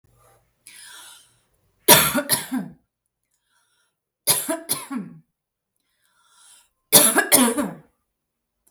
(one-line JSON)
{"three_cough_length": "8.7 s", "three_cough_amplitude": 32768, "three_cough_signal_mean_std_ratio": 0.32, "survey_phase": "beta (2021-08-13 to 2022-03-07)", "age": "18-44", "gender": "Female", "wearing_mask": "No", "symptom_none": true, "smoker_status": "Never smoked", "respiratory_condition_asthma": true, "respiratory_condition_other": false, "recruitment_source": "REACT", "submission_delay": "1 day", "covid_test_result": "Negative", "covid_test_method": "RT-qPCR"}